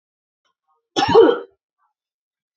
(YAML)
cough_length: 2.6 s
cough_amplitude: 27455
cough_signal_mean_std_ratio: 0.3
survey_phase: beta (2021-08-13 to 2022-03-07)
age: 18-44
gender: Female
wearing_mask: 'No'
symptom_cough_any: true
symptom_fatigue: true
symptom_headache: true
symptom_onset: 13 days
smoker_status: Ex-smoker
respiratory_condition_asthma: false
respiratory_condition_other: false
recruitment_source: REACT
submission_delay: 2 days
covid_test_result: Negative
covid_test_method: RT-qPCR